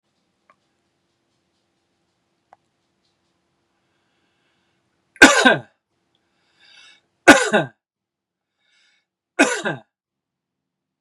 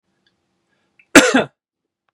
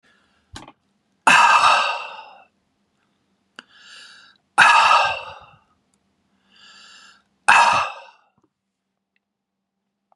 {"three_cough_length": "11.0 s", "three_cough_amplitude": 32768, "three_cough_signal_mean_std_ratio": 0.2, "cough_length": "2.1 s", "cough_amplitude": 32768, "cough_signal_mean_std_ratio": 0.25, "exhalation_length": "10.2 s", "exhalation_amplitude": 32768, "exhalation_signal_mean_std_ratio": 0.34, "survey_phase": "beta (2021-08-13 to 2022-03-07)", "age": "45-64", "gender": "Male", "wearing_mask": "No", "symptom_none": true, "smoker_status": "Ex-smoker", "respiratory_condition_asthma": false, "respiratory_condition_other": false, "recruitment_source": "REACT", "submission_delay": "0 days", "covid_test_result": "Negative", "covid_test_method": "RT-qPCR", "influenza_a_test_result": "Negative", "influenza_b_test_result": "Negative"}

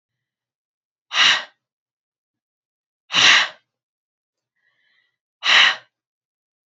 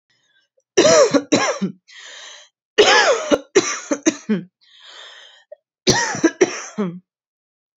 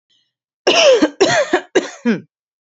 {"exhalation_length": "6.7 s", "exhalation_amplitude": 32275, "exhalation_signal_mean_std_ratio": 0.29, "three_cough_length": "7.8 s", "three_cough_amplitude": 32200, "three_cough_signal_mean_std_ratio": 0.45, "cough_length": "2.7 s", "cough_amplitude": 29123, "cough_signal_mean_std_ratio": 0.52, "survey_phase": "alpha (2021-03-01 to 2021-08-12)", "age": "18-44", "gender": "Female", "wearing_mask": "No", "symptom_none": true, "smoker_status": "Ex-smoker", "respiratory_condition_asthma": false, "respiratory_condition_other": false, "recruitment_source": "REACT", "submission_delay": "1 day", "covid_test_result": "Negative", "covid_test_method": "RT-qPCR"}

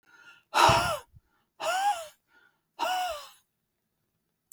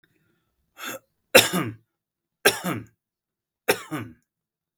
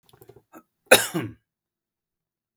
{"exhalation_length": "4.5 s", "exhalation_amplitude": 13725, "exhalation_signal_mean_std_ratio": 0.41, "three_cough_length": "4.8 s", "three_cough_amplitude": 32767, "three_cough_signal_mean_std_ratio": 0.26, "cough_length": "2.6 s", "cough_amplitude": 32766, "cough_signal_mean_std_ratio": 0.2, "survey_phase": "beta (2021-08-13 to 2022-03-07)", "age": "18-44", "gender": "Male", "wearing_mask": "No", "symptom_none": true, "smoker_status": "Never smoked", "respiratory_condition_asthma": false, "respiratory_condition_other": false, "recruitment_source": "REACT", "submission_delay": "2 days", "covid_test_result": "Negative", "covid_test_method": "RT-qPCR", "influenza_a_test_result": "Negative", "influenza_b_test_result": "Negative"}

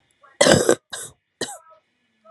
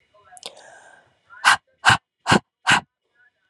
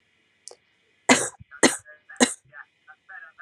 {"cough_length": "2.3 s", "cough_amplitude": 32768, "cough_signal_mean_std_ratio": 0.32, "exhalation_length": "3.5 s", "exhalation_amplitude": 28345, "exhalation_signal_mean_std_ratio": 0.3, "three_cough_length": "3.4 s", "three_cough_amplitude": 30684, "three_cough_signal_mean_std_ratio": 0.26, "survey_phase": "alpha (2021-03-01 to 2021-08-12)", "age": "18-44", "gender": "Female", "wearing_mask": "No", "symptom_none": true, "smoker_status": "Never smoked", "respiratory_condition_asthma": false, "respiratory_condition_other": false, "recruitment_source": "Test and Trace", "submission_delay": "1 day", "covid_test_result": "Positive", "covid_test_method": "LFT"}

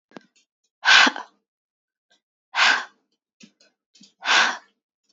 {"exhalation_length": "5.1 s", "exhalation_amplitude": 27797, "exhalation_signal_mean_std_ratio": 0.31, "survey_phase": "beta (2021-08-13 to 2022-03-07)", "age": "18-44", "gender": "Female", "wearing_mask": "No", "symptom_cough_any": true, "symptom_runny_or_blocked_nose": true, "smoker_status": "Never smoked", "respiratory_condition_asthma": false, "respiratory_condition_other": false, "recruitment_source": "REACT", "submission_delay": "1 day", "covid_test_result": "Negative", "covid_test_method": "RT-qPCR", "influenza_a_test_result": "Negative", "influenza_b_test_result": "Negative"}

